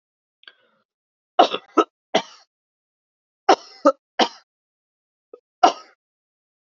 {
  "three_cough_length": "6.7 s",
  "three_cough_amplitude": 32767,
  "three_cough_signal_mean_std_ratio": 0.21,
  "survey_phase": "beta (2021-08-13 to 2022-03-07)",
  "age": "18-44",
  "gender": "Female",
  "wearing_mask": "No",
  "symptom_cough_any": true,
  "symptom_new_continuous_cough": true,
  "symptom_runny_or_blocked_nose": true,
  "symptom_shortness_of_breath": true,
  "symptom_sore_throat": true,
  "symptom_fatigue": true,
  "symptom_fever_high_temperature": true,
  "symptom_headache": true,
  "symptom_onset": "3 days",
  "smoker_status": "Ex-smoker",
  "respiratory_condition_asthma": false,
  "respiratory_condition_other": false,
  "recruitment_source": "Test and Trace",
  "submission_delay": "1 day",
  "covid_test_result": "Positive",
  "covid_test_method": "RT-qPCR",
  "covid_ct_value": 21.4,
  "covid_ct_gene": "ORF1ab gene",
  "covid_ct_mean": 22.0,
  "covid_viral_load": "59000 copies/ml",
  "covid_viral_load_category": "Low viral load (10K-1M copies/ml)"
}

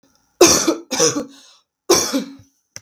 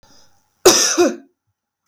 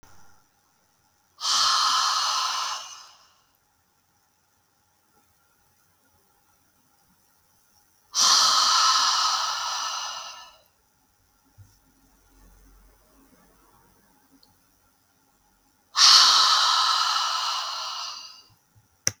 {
  "three_cough_length": "2.8 s",
  "three_cough_amplitude": 32768,
  "three_cough_signal_mean_std_ratio": 0.45,
  "cough_length": "1.9 s",
  "cough_amplitude": 32766,
  "cough_signal_mean_std_ratio": 0.39,
  "exhalation_length": "19.2 s",
  "exhalation_amplitude": 32766,
  "exhalation_signal_mean_std_ratio": 0.42,
  "survey_phase": "beta (2021-08-13 to 2022-03-07)",
  "age": "18-44",
  "gender": "Female",
  "wearing_mask": "No",
  "symptom_fatigue": true,
  "smoker_status": "Ex-smoker",
  "respiratory_condition_asthma": false,
  "respiratory_condition_other": false,
  "recruitment_source": "REACT",
  "submission_delay": "2 days",
  "covid_test_result": "Negative",
  "covid_test_method": "RT-qPCR"
}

